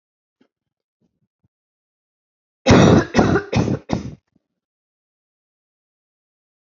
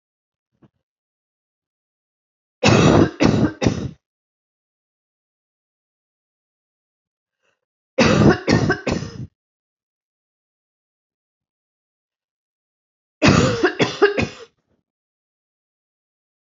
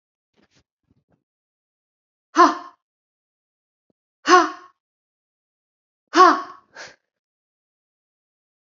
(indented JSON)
{
  "cough_length": "6.7 s",
  "cough_amplitude": 28190,
  "cough_signal_mean_std_ratio": 0.29,
  "three_cough_length": "16.6 s",
  "three_cough_amplitude": 29554,
  "three_cough_signal_mean_std_ratio": 0.31,
  "exhalation_length": "8.7 s",
  "exhalation_amplitude": 27873,
  "exhalation_signal_mean_std_ratio": 0.21,
  "survey_phase": "alpha (2021-03-01 to 2021-08-12)",
  "age": "18-44",
  "gender": "Female",
  "wearing_mask": "No",
  "symptom_none": true,
  "smoker_status": "Never smoked",
  "respiratory_condition_asthma": true,
  "respiratory_condition_other": false,
  "recruitment_source": "REACT",
  "submission_delay": "2 days",
  "covid_test_result": "Negative",
  "covid_test_method": "RT-qPCR"
}